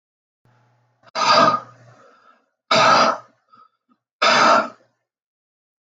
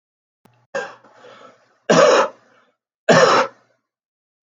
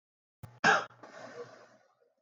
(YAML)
exhalation_length: 5.8 s
exhalation_amplitude: 25697
exhalation_signal_mean_std_ratio: 0.41
three_cough_length: 4.4 s
three_cough_amplitude: 27979
three_cough_signal_mean_std_ratio: 0.36
cough_length: 2.2 s
cough_amplitude: 7470
cough_signal_mean_std_ratio: 0.29
survey_phase: alpha (2021-03-01 to 2021-08-12)
age: 65+
gender: Male
wearing_mask: 'No'
symptom_none: true
smoker_status: Never smoked
respiratory_condition_asthma: false
respiratory_condition_other: false
recruitment_source: REACT
submission_delay: 1 day
covid_test_result: Negative
covid_test_method: RT-qPCR